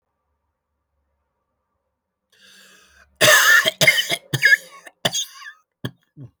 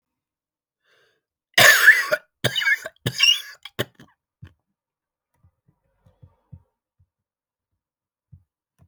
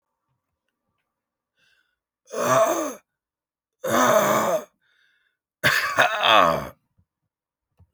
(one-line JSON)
{"cough_length": "6.4 s", "cough_amplitude": 29969, "cough_signal_mean_std_ratio": 0.34, "three_cough_length": "8.9 s", "three_cough_amplitude": 32768, "three_cough_signal_mean_std_ratio": 0.26, "exhalation_length": "7.9 s", "exhalation_amplitude": 23999, "exhalation_signal_mean_std_ratio": 0.42, "survey_phase": "alpha (2021-03-01 to 2021-08-12)", "age": "45-64", "gender": "Male", "wearing_mask": "No", "symptom_cough_any": true, "symptom_shortness_of_breath": true, "symptom_headache": true, "symptom_onset": "12 days", "smoker_status": "Never smoked", "respiratory_condition_asthma": false, "respiratory_condition_other": false, "recruitment_source": "REACT", "submission_delay": "2 days", "covid_test_result": "Negative", "covid_test_method": "RT-qPCR"}